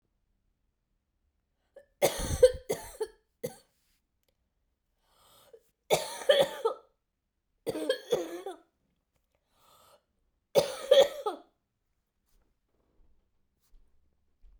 {"three_cough_length": "14.6 s", "three_cough_amplitude": 11807, "three_cough_signal_mean_std_ratio": 0.26, "survey_phase": "beta (2021-08-13 to 2022-03-07)", "age": "45-64", "gender": "Female", "wearing_mask": "No", "symptom_cough_any": true, "symptom_runny_or_blocked_nose": true, "symptom_fatigue": true, "symptom_fever_high_temperature": true, "symptom_headache": true, "symptom_onset": "3 days", "smoker_status": "Never smoked", "respiratory_condition_asthma": true, "respiratory_condition_other": false, "recruitment_source": "Test and Trace", "submission_delay": "1 day", "covid_test_result": "Positive", "covid_test_method": "ePCR"}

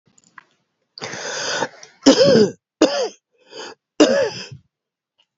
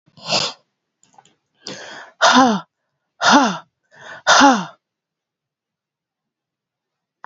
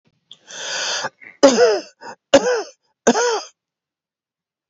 {"cough_length": "5.4 s", "cough_amplitude": 31779, "cough_signal_mean_std_ratio": 0.4, "exhalation_length": "7.3 s", "exhalation_amplitude": 30652, "exhalation_signal_mean_std_ratio": 0.34, "three_cough_length": "4.7 s", "three_cough_amplitude": 28658, "three_cough_signal_mean_std_ratio": 0.4, "survey_phase": "beta (2021-08-13 to 2022-03-07)", "age": "45-64", "gender": "Female", "wearing_mask": "No", "symptom_cough_any": true, "symptom_runny_or_blocked_nose": true, "symptom_sore_throat": true, "symptom_fatigue": true, "symptom_headache": true, "symptom_change_to_sense_of_smell_or_taste": true, "smoker_status": "Never smoked", "respiratory_condition_asthma": false, "respiratory_condition_other": false, "recruitment_source": "Test and Trace", "submission_delay": "2 days", "covid_test_result": "Positive", "covid_test_method": "LFT"}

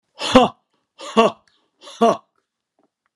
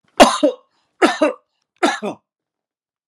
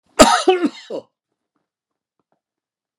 {"exhalation_length": "3.2 s", "exhalation_amplitude": 32767, "exhalation_signal_mean_std_ratio": 0.31, "three_cough_length": "3.1 s", "three_cough_amplitude": 32768, "three_cough_signal_mean_std_ratio": 0.35, "cough_length": "3.0 s", "cough_amplitude": 32768, "cough_signal_mean_std_ratio": 0.29, "survey_phase": "alpha (2021-03-01 to 2021-08-12)", "age": "65+", "gender": "Male", "wearing_mask": "No", "symptom_none": true, "symptom_onset": "4 days", "smoker_status": "Ex-smoker", "respiratory_condition_asthma": false, "respiratory_condition_other": false, "recruitment_source": "REACT", "submission_delay": "2 days", "covid_test_result": "Negative", "covid_test_method": "RT-qPCR"}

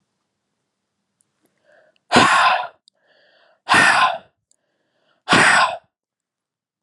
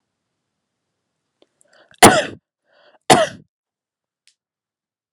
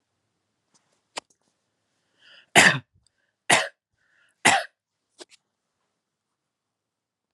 {"exhalation_length": "6.8 s", "exhalation_amplitude": 32390, "exhalation_signal_mean_std_ratio": 0.38, "cough_length": "5.1 s", "cough_amplitude": 32768, "cough_signal_mean_std_ratio": 0.2, "three_cough_length": "7.3 s", "three_cough_amplitude": 29233, "three_cough_signal_mean_std_ratio": 0.2, "survey_phase": "beta (2021-08-13 to 2022-03-07)", "age": "18-44", "gender": "Male", "wearing_mask": "No", "symptom_fatigue": true, "symptom_onset": "12 days", "smoker_status": "Ex-smoker", "respiratory_condition_asthma": false, "respiratory_condition_other": false, "recruitment_source": "REACT", "submission_delay": "5 days", "covid_test_result": "Negative", "covid_test_method": "RT-qPCR", "influenza_a_test_result": "Negative", "influenza_b_test_result": "Negative"}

